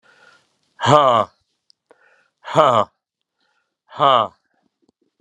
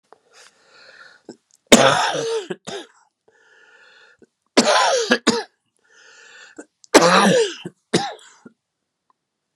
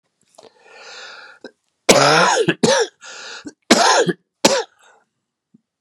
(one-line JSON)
{"exhalation_length": "5.2 s", "exhalation_amplitude": 32767, "exhalation_signal_mean_std_ratio": 0.32, "three_cough_length": "9.6 s", "three_cough_amplitude": 32768, "three_cough_signal_mean_std_ratio": 0.37, "cough_length": "5.8 s", "cough_amplitude": 32768, "cough_signal_mean_std_ratio": 0.43, "survey_phase": "beta (2021-08-13 to 2022-03-07)", "age": "65+", "gender": "Male", "wearing_mask": "No", "symptom_cough_any": true, "symptom_new_continuous_cough": true, "symptom_runny_or_blocked_nose": true, "symptom_fatigue": true, "symptom_onset": "9 days", "smoker_status": "Never smoked", "respiratory_condition_asthma": false, "respiratory_condition_other": false, "recruitment_source": "Test and Trace", "submission_delay": "1 day", "covid_test_result": "Positive", "covid_test_method": "RT-qPCR", "covid_ct_value": 18.1, "covid_ct_gene": "ORF1ab gene", "covid_ct_mean": 19.2, "covid_viral_load": "490000 copies/ml", "covid_viral_load_category": "Low viral load (10K-1M copies/ml)"}